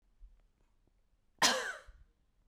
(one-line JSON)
{"cough_length": "2.5 s", "cough_amplitude": 7706, "cough_signal_mean_std_ratio": 0.28, "survey_phase": "beta (2021-08-13 to 2022-03-07)", "age": "18-44", "gender": "Female", "wearing_mask": "No", "symptom_cough_any": true, "symptom_sore_throat": true, "symptom_fatigue": true, "symptom_headache": true, "smoker_status": "Never smoked", "respiratory_condition_asthma": false, "respiratory_condition_other": false, "recruitment_source": "Test and Trace", "submission_delay": "1 day", "covid_test_result": "Positive", "covid_test_method": "LFT"}